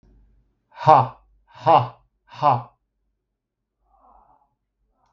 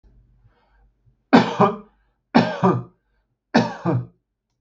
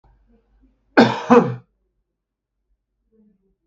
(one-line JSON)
{"exhalation_length": "5.1 s", "exhalation_amplitude": 32768, "exhalation_signal_mean_std_ratio": 0.26, "three_cough_length": "4.6 s", "three_cough_amplitude": 32766, "three_cough_signal_mean_std_ratio": 0.37, "cough_length": "3.7 s", "cough_amplitude": 32768, "cough_signal_mean_std_ratio": 0.25, "survey_phase": "beta (2021-08-13 to 2022-03-07)", "age": "45-64", "gender": "Male", "wearing_mask": "No", "symptom_none": true, "smoker_status": "Never smoked", "respiratory_condition_asthma": false, "respiratory_condition_other": false, "recruitment_source": "REACT", "submission_delay": "0 days", "covid_test_result": "Negative", "covid_test_method": "RT-qPCR", "influenza_a_test_result": "Unknown/Void", "influenza_b_test_result": "Unknown/Void"}